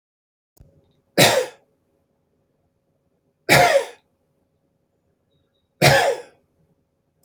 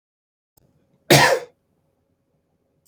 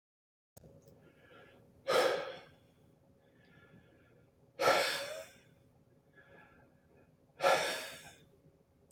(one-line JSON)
{"three_cough_length": "7.2 s", "three_cough_amplitude": 31827, "three_cough_signal_mean_std_ratio": 0.29, "cough_length": "2.9 s", "cough_amplitude": 32300, "cough_signal_mean_std_ratio": 0.25, "exhalation_length": "8.9 s", "exhalation_amplitude": 5403, "exhalation_signal_mean_std_ratio": 0.34, "survey_phase": "beta (2021-08-13 to 2022-03-07)", "age": "45-64", "gender": "Male", "wearing_mask": "No", "symptom_none": true, "smoker_status": "Never smoked", "respiratory_condition_asthma": false, "respiratory_condition_other": false, "recruitment_source": "REACT", "submission_delay": "2 days", "covid_test_result": "Negative", "covid_test_method": "RT-qPCR", "influenza_a_test_result": "Negative", "influenza_b_test_result": "Negative"}